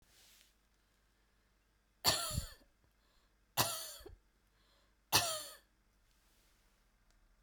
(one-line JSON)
{"three_cough_length": "7.4 s", "three_cough_amplitude": 5697, "three_cough_signal_mean_std_ratio": 0.29, "survey_phase": "beta (2021-08-13 to 2022-03-07)", "age": "45-64", "gender": "Female", "wearing_mask": "No", "symptom_none": true, "symptom_onset": "6 days", "smoker_status": "Ex-smoker", "respiratory_condition_asthma": false, "respiratory_condition_other": false, "recruitment_source": "REACT", "submission_delay": "2 days", "covid_test_result": "Negative", "covid_test_method": "RT-qPCR"}